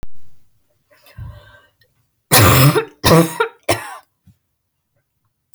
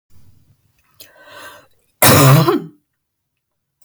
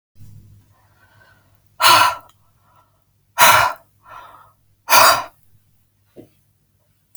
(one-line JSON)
{"three_cough_length": "5.5 s", "three_cough_amplitude": 32768, "three_cough_signal_mean_std_ratio": 0.39, "cough_length": "3.8 s", "cough_amplitude": 32768, "cough_signal_mean_std_ratio": 0.34, "exhalation_length": "7.2 s", "exhalation_amplitude": 32768, "exhalation_signal_mean_std_ratio": 0.31, "survey_phase": "alpha (2021-03-01 to 2021-08-12)", "age": "18-44", "gender": "Female", "wearing_mask": "No", "symptom_cough_any": true, "smoker_status": "Never smoked", "respiratory_condition_asthma": false, "respiratory_condition_other": false, "recruitment_source": "REACT", "submission_delay": "1 day", "covid_test_result": "Negative", "covid_test_method": "RT-qPCR"}